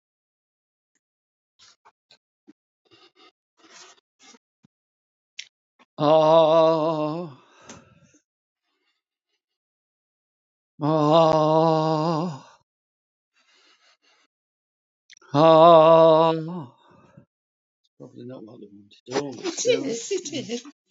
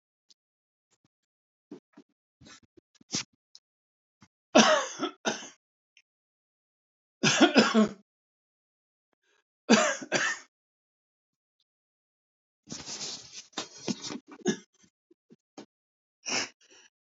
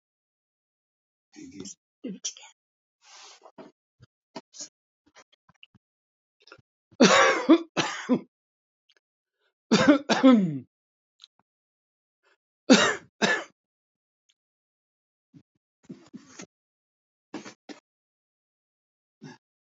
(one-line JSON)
{"exhalation_length": "20.9 s", "exhalation_amplitude": 24243, "exhalation_signal_mean_std_ratio": 0.34, "three_cough_length": "17.1 s", "three_cough_amplitude": 18754, "three_cough_signal_mean_std_ratio": 0.27, "cough_length": "19.6 s", "cough_amplitude": 23179, "cough_signal_mean_std_ratio": 0.25, "survey_phase": "alpha (2021-03-01 to 2021-08-12)", "age": "65+", "gender": "Male", "wearing_mask": "No", "symptom_none": true, "smoker_status": "Never smoked", "respiratory_condition_asthma": false, "respiratory_condition_other": false, "recruitment_source": "REACT", "submission_delay": "2 days", "covid_test_result": "Negative", "covid_test_method": "RT-qPCR"}